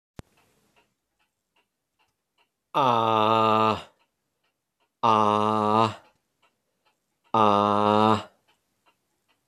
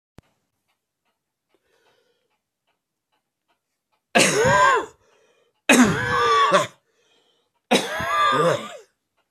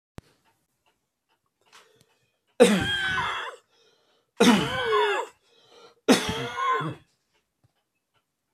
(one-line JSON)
{"exhalation_length": "9.5 s", "exhalation_amplitude": 19013, "exhalation_signal_mean_std_ratio": 0.38, "cough_length": "9.3 s", "cough_amplitude": 28135, "cough_signal_mean_std_ratio": 0.43, "three_cough_length": "8.5 s", "three_cough_amplitude": 23936, "three_cough_signal_mean_std_ratio": 0.39, "survey_phase": "beta (2021-08-13 to 2022-03-07)", "age": "65+", "gender": "Male", "wearing_mask": "No", "symptom_cough_any": true, "symptom_runny_or_blocked_nose": true, "symptom_change_to_sense_of_smell_or_taste": true, "symptom_onset": "5 days", "smoker_status": "Never smoked", "respiratory_condition_asthma": false, "respiratory_condition_other": false, "recruitment_source": "Test and Trace", "submission_delay": "1 day", "covid_test_result": "Positive", "covid_test_method": "RT-qPCR"}